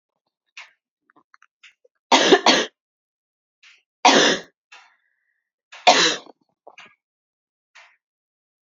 {
  "three_cough_length": "8.6 s",
  "three_cough_amplitude": 31053,
  "three_cough_signal_mean_std_ratio": 0.28,
  "survey_phase": "beta (2021-08-13 to 2022-03-07)",
  "age": "18-44",
  "gender": "Female",
  "wearing_mask": "No",
  "symptom_runny_or_blocked_nose": true,
  "symptom_headache": true,
  "smoker_status": "Never smoked",
  "respiratory_condition_asthma": false,
  "respiratory_condition_other": false,
  "recruitment_source": "Test and Trace",
  "submission_delay": "2 days",
  "covid_test_result": "Positive",
  "covid_test_method": "ePCR"
}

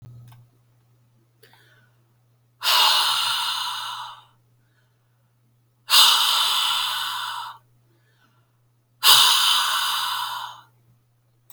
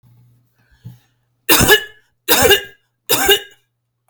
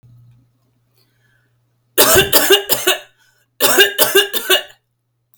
{
  "exhalation_length": "11.5 s",
  "exhalation_amplitude": 32767,
  "exhalation_signal_mean_std_ratio": 0.47,
  "three_cough_length": "4.1 s",
  "three_cough_amplitude": 32768,
  "three_cough_signal_mean_std_ratio": 0.39,
  "cough_length": "5.4 s",
  "cough_amplitude": 32768,
  "cough_signal_mean_std_ratio": 0.44,
  "survey_phase": "beta (2021-08-13 to 2022-03-07)",
  "age": "45-64",
  "gender": "Female",
  "wearing_mask": "No",
  "symptom_none": true,
  "smoker_status": "Ex-smoker",
  "respiratory_condition_asthma": false,
  "respiratory_condition_other": false,
  "recruitment_source": "REACT",
  "submission_delay": "1 day",
  "covid_test_result": "Negative",
  "covid_test_method": "RT-qPCR"
}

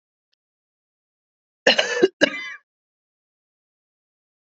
{
  "cough_length": "4.5 s",
  "cough_amplitude": 27500,
  "cough_signal_mean_std_ratio": 0.23,
  "survey_phase": "beta (2021-08-13 to 2022-03-07)",
  "age": "45-64",
  "gender": "Female",
  "wearing_mask": "No",
  "symptom_cough_any": true,
  "symptom_runny_or_blocked_nose": true,
  "symptom_shortness_of_breath": true,
  "symptom_fatigue": true,
  "symptom_headache": true,
  "symptom_other": true,
  "symptom_onset": "2 days",
  "smoker_status": "Ex-smoker",
  "respiratory_condition_asthma": false,
  "respiratory_condition_other": false,
  "recruitment_source": "Test and Trace",
  "submission_delay": "0 days",
  "covid_test_result": "Positive",
  "covid_test_method": "RT-qPCR",
  "covid_ct_value": 15.0,
  "covid_ct_gene": "ORF1ab gene",
  "covid_ct_mean": 15.4,
  "covid_viral_load": "9100000 copies/ml",
  "covid_viral_load_category": "High viral load (>1M copies/ml)"
}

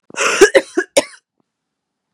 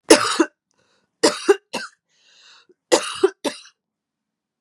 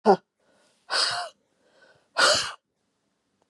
{
  "cough_length": "2.1 s",
  "cough_amplitude": 32768,
  "cough_signal_mean_std_ratio": 0.35,
  "three_cough_length": "4.6 s",
  "three_cough_amplitude": 32768,
  "three_cough_signal_mean_std_ratio": 0.3,
  "exhalation_length": "3.5 s",
  "exhalation_amplitude": 21076,
  "exhalation_signal_mean_std_ratio": 0.34,
  "survey_phase": "beta (2021-08-13 to 2022-03-07)",
  "age": "45-64",
  "gender": "Female",
  "wearing_mask": "No",
  "symptom_cough_any": true,
  "symptom_runny_or_blocked_nose": true,
  "symptom_fatigue": true,
  "symptom_headache": true,
  "symptom_other": true,
  "smoker_status": "Ex-smoker",
  "respiratory_condition_asthma": false,
  "respiratory_condition_other": false,
  "recruitment_source": "Test and Trace",
  "submission_delay": "1 day",
  "covid_test_result": "Positive",
  "covid_test_method": "LFT"
}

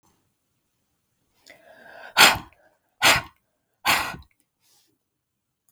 {
  "exhalation_length": "5.7 s",
  "exhalation_amplitude": 32766,
  "exhalation_signal_mean_std_ratio": 0.25,
  "survey_phase": "beta (2021-08-13 to 2022-03-07)",
  "age": "65+",
  "gender": "Female",
  "wearing_mask": "No",
  "symptom_none": true,
  "smoker_status": "Never smoked",
  "respiratory_condition_asthma": false,
  "respiratory_condition_other": false,
  "recruitment_source": "REACT",
  "submission_delay": "3 days",
  "covid_test_result": "Negative",
  "covid_test_method": "RT-qPCR",
  "influenza_a_test_result": "Unknown/Void",
  "influenza_b_test_result": "Unknown/Void"
}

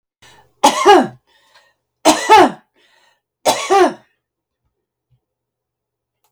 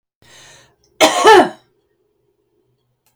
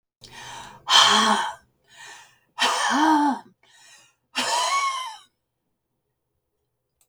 {
  "three_cough_length": "6.3 s",
  "three_cough_amplitude": 32768,
  "three_cough_signal_mean_std_ratio": 0.34,
  "cough_length": "3.2 s",
  "cough_amplitude": 32768,
  "cough_signal_mean_std_ratio": 0.31,
  "exhalation_length": "7.1 s",
  "exhalation_amplitude": 28406,
  "exhalation_signal_mean_std_ratio": 0.46,
  "survey_phase": "beta (2021-08-13 to 2022-03-07)",
  "age": "65+",
  "gender": "Female",
  "wearing_mask": "No",
  "symptom_none": true,
  "smoker_status": "Ex-smoker",
  "respiratory_condition_asthma": false,
  "respiratory_condition_other": false,
  "recruitment_source": "REACT",
  "submission_delay": "2 days",
  "covid_test_result": "Negative",
  "covid_test_method": "RT-qPCR",
  "influenza_a_test_result": "Negative",
  "influenza_b_test_result": "Negative"
}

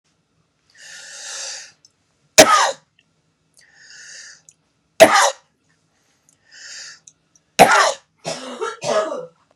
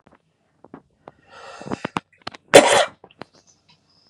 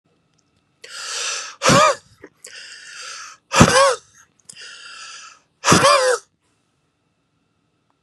{
  "three_cough_length": "9.6 s",
  "three_cough_amplitude": 32768,
  "three_cough_signal_mean_std_ratio": 0.3,
  "cough_length": "4.1 s",
  "cough_amplitude": 32768,
  "cough_signal_mean_std_ratio": 0.23,
  "exhalation_length": "8.0 s",
  "exhalation_amplitude": 32768,
  "exhalation_signal_mean_std_ratio": 0.37,
  "survey_phase": "beta (2021-08-13 to 2022-03-07)",
  "age": "45-64",
  "gender": "Male",
  "wearing_mask": "No",
  "symptom_cough_any": true,
  "symptom_runny_or_blocked_nose": true,
  "symptom_fever_high_temperature": true,
  "symptom_headache": true,
  "symptom_change_to_sense_of_smell_or_taste": true,
  "symptom_onset": "4 days",
  "smoker_status": "Never smoked",
  "respiratory_condition_asthma": false,
  "respiratory_condition_other": false,
  "recruitment_source": "Test and Trace",
  "submission_delay": "2 days",
  "covid_test_result": "Positive",
  "covid_test_method": "RT-qPCR",
  "covid_ct_value": 10.6,
  "covid_ct_gene": "N gene",
  "covid_ct_mean": 11.3,
  "covid_viral_load": "200000000 copies/ml",
  "covid_viral_load_category": "High viral load (>1M copies/ml)"
}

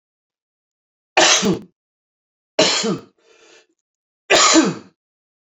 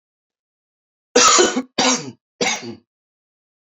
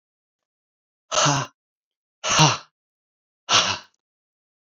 {
  "three_cough_length": "5.5 s",
  "three_cough_amplitude": 30924,
  "three_cough_signal_mean_std_ratio": 0.38,
  "cough_length": "3.7 s",
  "cough_amplitude": 28808,
  "cough_signal_mean_std_ratio": 0.39,
  "exhalation_length": "4.7 s",
  "exhalation_amplitude": 25968,
  "exhalation_signal_mean_std_ratio": 0.34,
  "survey_phase": "alpha (2021-03-01 to 2021-08-12)",
  "age": "45-64",
  "gender": "Male",
  "wearing_mask": "No",
  "symptom_cough_any": true,
  "symptom_fatigue": true,
  "smoker_status": "Never smoked",
  "recruitment_source": "Test and Trace",
  "submission_delay": "2 days",
  "covid_test_result": "Positive",
  "covid_test_method": "RT-qPCR",
  "covid_ct_value": 27.4,
  "covid_ct_gene": "N gene",
  "covid_ct_mean": 27.9,
  "covid_viral_load": "680 copies/ml",
  "covid_viral_load_category": "Minimal viral load (< 10K copies/ml)"
}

